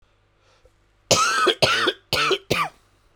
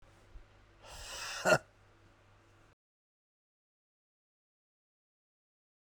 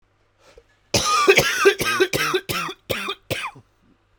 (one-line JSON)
{"three_cough_length": "3.2 s", "three_cough_amplitude": 31392, "three_cough_signal_mean_std_ratio": 0.52, "exhalation_length": "5.8 s", "exhalation_amplitude": 6506, "exhalation_signal_mean_std_ratio": 0.2, "cough_length": "4.2 s", "cough_amplitude": 30837, "cough_signal_mean_std_ratio": 0.53, "survey_phase": "beta (2021-08-13 to 2022-03-07)", "age": "18-44", "gender": "Male", "wearing_mask": "No", "symptom_cough_any": true, "symptom_new_continuous_cough": true, "symptom_runny_or_blocked_nose": true, "symptom_shortness_of_breath": true, "symptom_sore_throat": true, "symptom_abdominal_pain": true, "symptom_fatigue": true, "symptom_fever_high_temperature": true, "symptom_headache": true, "symptom_onset": "2 days", "smoker_status": "Never smoked", "respiratory_condition_asthma": true, "respiratory_condition_other": false, "recruitment_source": "Test and Trace", "submission_delay": "1 day", "covid_test_result": "Positive", "covid_test_method": "RT-qPCR", "covid_ct_value": 16.1, "covid_ct_gene": "ORF1ab gene", "covid_ct_mean": 16.6, "covid_viral_load": "3700000 copies/ml", "covid_viral_load_category": "High viral load (>1M copies/ml)"}